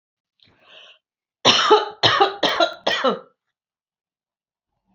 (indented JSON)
{
  "cough_length": "4.9 s",
  "cough_amplitude": 29058,
  "cough_signal_mean_std_ratio": 0.39,
  "survey_phase": "beta (2021-08-13 to 2022-03-07)",
  "age": "45-64",
  "gender": "Female",
  "wearing_mask": "No",
  "symptom_none": true,
  "smoker_status": "Never smoked",
  "respiratory_condition_asthma": false,
  "respiratory_condition_other": false,
  "recruitment_source": "REACT",
  "submission_delay": "1 day",
  "covid_test_result": "Negative",
  "covid_test_method": "RT-qPCR",
  "influenza_a_test_result": "Negative",
  "influenza_b_test_result": "Negative"
}